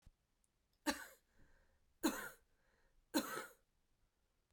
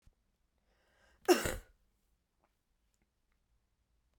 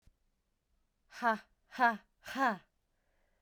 {"three_cough_length": "4.5 s", "three_cough_amplitude": 2055, "three_cough_signal_mean_std_ratio": 0.29, "cough_length": "4.2 s", "cough_amplitude": 6825, "cough_signal_mean_std_ratio": 0.17, "exhalation_length": "3.4 s", "exhalation_amplitude": 6003, "exhalation_signal_mean_std_ratio": 0.32, "survey_phase": "beta (2021-08-13 to 2022-03-07)", "age": "18-44", "gender": "Female", "wearing_mask": "No", "symptom_runny_or_blocked_nose": true, "symptom_shortness_of_breath": true, "symptom_fatigue": true, "symptom_fever_high_temperature": true, "symptom_headache": true, "symptom_change_to_sense_of_smell_or_taste": true, "symptom_loss_of_taste": true, "symptom_onset": "3 days", "smoker_status": "Never smoked", "respiratory_condition_asthma": true, "respiratory_condition_other": false, "recruitment_source": "Test and Trace", "submission_delay": "2 days", "covid_test_result": "Positive", "covid_test_method": "RT-qPCR"}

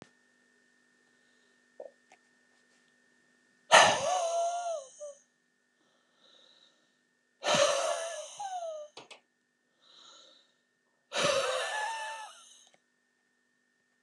{"exhalation_length": "14.0 s", "exhalation_amplitude": 16700, "exhalation_signal_mean_std_ratio": 0.35, "survey_phase": "alpha (2021-03-01 to 2021-08-12)", "age": "65+", "gender": "Male", "wearing_mask": "No", "symptom_none": true, "smoker_status": "Never smoked", "respiratory_condition_asthma": false, "respiratory_condition_other": false, "recruitment_source": "REACT", "submission_delay": "5 days", "covid_test_result": "Negative", "covid_test_method": "RT-qPCR"}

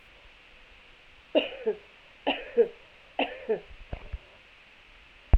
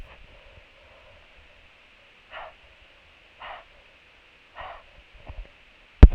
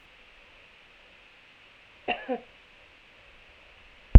{"three_cough_length": "5.4 s", "three_cough_amplitude": 13472, "three_cough_signal_mean_std_ratio": 0.32, "exhalation_length": "6.1 s", "exhalation_amplitude": 32768, "exhalation_signal_mean_std_ratio": 0.13, "cough_length": "4.2 s", "cough_amplitude": 32768, "cough_signal_mean_std_ratio": 0.12, "survey_phase": "beta (2021-08-13 to 2022-03-07)", "age": "45-64", "gender": "Female", "wearing_mask": "No", "symptom_new_continuous_cough": true, "symptom_runny_or_blocked_nose": true, "symptom_abdominal_pain": true, "symptom_headache": true, "symptom_onset": "4 days", "smoker_status": "Never smoked", "respiratory_condition_asthma": false, "respiratory_condition_other": false, "recruitment_source": "Test and Trace", "submission_delay": "1 day", "covid_test_result": "Positive", "covid_test_method": "RT-qPCR", "covid_ct_value": 20.5, "covid_ct_gene": "ORF1ab gene", "covid_ct_mean": 21.0, "covid_viral_load": "130000 copies/ml", "covid_viral_load_category": "Low viral load (10K-1M copies/ml)"}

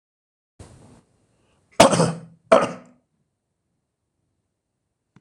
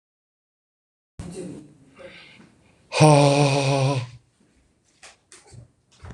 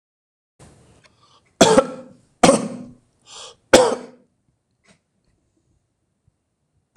{"cough_length": "5.2 s", "cough_amplitude": 26028, "cough_signal_mean_std_ratio": 0.23, "exhalation_length": "6.1 s", "exhalation_amplitude": 25959, "exhalation_signal_mean_std_ratio": 0.36, "three_cough_length": "7.0 s", "three_cough_amplitude": 26028, "three_cough_signal_mean_std_ratio": 0.25, "survey_phase": "beta (2021-08-13 to 2022-03-07)", "age": "45-64", "gender": "Male", "wearing_mask": "No", "symptom_none": true, "smoker_status": "Ex-smoker", "respiratory_condition_asthma": false, "respiratory_condition_other": false, "recruitment_source": "REACT", "submission_delay": "3 days", "covid_test_result": "Negative", "covid_test_method": "RT-qPCR"}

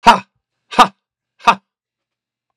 {"exhalation_length": "2.6 s", "exhalation_amplitude": 32768, "exhalation_signal_mean_std_ratio": 0.25, "survey_phase": "beta (2021-08-13 to 2022-03-07)", "age": "45-64", "gender": "Male", "wearing_mask": "No", "symptom_none": true, "smoker_status": "Ex-smoker", "respiratory_condition_asthma": true, "respiratory_condition_other": false, "recruitment_source": "REACT", "submission_delay": "1 day", "covid_test_result": "Negative", "covid_test_method": "RT-qPCR", "influenza_a_test_result": "Negative", "influenza_b_test_result": "Negative"}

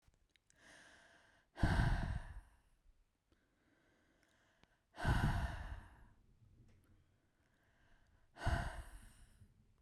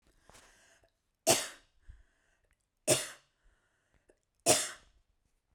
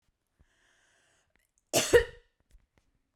{"exhalation_length": "9.8 s", "exhalation_amplitude": 2939, "exhalation_signal_mean_std_ratio": 0.36, "three_cough_length": "5.5 s", "three_cough_amplitude": 10090, "three_cough_signal_mean_std_ratio": 0.25, "cough_length": "3.2 s", "cough_amplitude": 13601, "cough_signal_mean_std_ratio": 0.21, "survey_phase": "beta (2021-08-13 to 2022-03-07)", "age": "18-44", "gender": "Female", "wearing_mask": "No", "symptom_none": true, "symptom_onset": "12 days", "smoker_status": "Never smoked", "respiratory_condition_asthma": false, "respiratory_condition_other": false, "recruitment_source": "REACT", "submission_delay": "1 day", "covid_test_result": "Negative", "covid_test_method": "RT-qPCR"}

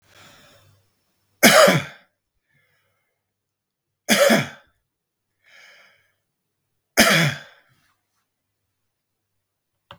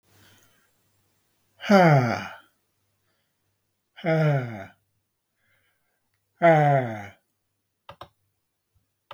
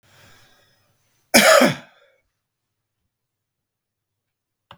{"three_cough_length": "10.0 s", "three_cough_amplitude": 32768, "three_cough_signal_mean_std_ratio": 0.26, "exhalation_length": "9.1 s", "exhalation_amplitude": 19019, "exhalation_signal_mean_std_ratio": 0.33, "cough_length": "4.8 s", "cough_amplitude": 32768, "cough_signal_mean_std_ratio": 0.23, "survey_phase": "beta (2021-08-13 to 2022-03-07)", "age": "45-64", "gender": "Male", "wearing_mask": "No", "symptom_none": true, "smoker_status": "Never smoked", "respiratory_condition_asthma": false, "respiratory_condition_other": false, "recruitment_source": "REACT", "submission_delay": "0 days", "covid_test_result": "Negative", "covid_test_method": "RT-qPCR", "influenza_a_test_result": "Unknown/Void", "influenza_b_test_result": "Unknown/Void"}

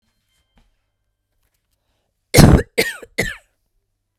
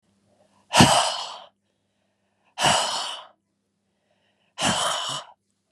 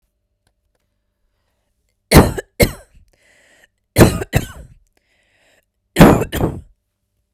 {"cough_length": "4.2 s", "cough_amplitude": 32768, "cough_signal_mean_std_ratio": 0.25, "exhalation_length": "5.7 s", "exhalation_amplitude": 29755, "exhalation_signal_mean_std_ratio": 0.39, "three_cough_length": "7.3 s", "three_cough_amplitude": 32768, "three_cough_signal_mean_std_ratio": 0.28, "survey_phase": "beta (2021-08-13 to 2022-03-07)", "age": "18-44", "gender": "Female", "wearing_mask": "No", "symptom_cough_any": true, "smoker_status": "Never smoked", "respiratory_condition_asthma": false, "respiratory_condition_other": false, "recruitment_source": "REACT", "submission_delay": "1 day", "covid_test_result": "Negative", "covid_test_method": "RT-qPCR"}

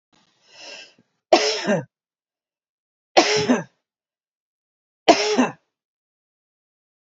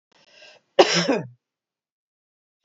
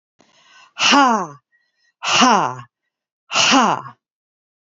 {"three_cough_length": "7.1 s", "three_cough_amplitude": 32701, "three_cough_signal_mean_std_ratio": 0.31, "cough_length": "2.6 s", "cough_amplitude": 27228, "cough_signal_mean_std_ratio": 0.27, "exhalation_length": "4.8 s", "exhalation_amplitude": 29167, "exhalation_signal_mean_std_ratio": 0.43, "survey_phase": "beta (2021-08-13 to 2022-03-07)", "age": "45-64", "gender": "Female", "wearing_mask": "No", "symptom_none": true, "symptom_onset": "6 days", "smoker_status": "Ex-smoker", "respiratory_condition_asthma": false, "respiratory_condition_other": false, "recruitment_source": "REACT", "submission_delay": "2 days", "covid_test_result": "Negative", "covid_test_method": "RT-qPCR", "influenza_a_test_result": "Negative", "influenza_b_test_result": "Negative"}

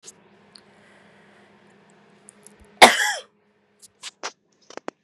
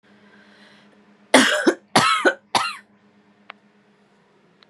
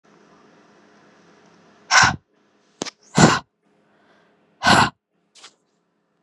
{"cough_length": "5.0 s", "cough_amplitude": 32768, "cough_signal_mean_std_ratio": 0.18, "three_cough_length": "4.7 s", "three_cough_amplitude": 32628, "three_cough_signal_mean_std_ratio": 0.34, "exhalation_length": "6.2 s", "exhalation_amplitude": 32768, "exhalation_signal_mean_std_ratio": 0.27, "survey_phase": "beta (2021-08-13 to 2022-03-07)", "age": "18-44", "gender": "Female", "wearing_mask": "No", "symptom_none": true, "symptom_onset": "3 days", "smoker_status": "Never smoked", "respiratory_condition_asthma": false, "respiratory_condition_other": false, "recruitment_source": "REACT", "submission_delay": "1 day", "covid_test_result": "Negative", "covid_test_method": "RT-qPCR", "influenza_a_test_result": "Negative", "influenza_b_test_result": "Negative"}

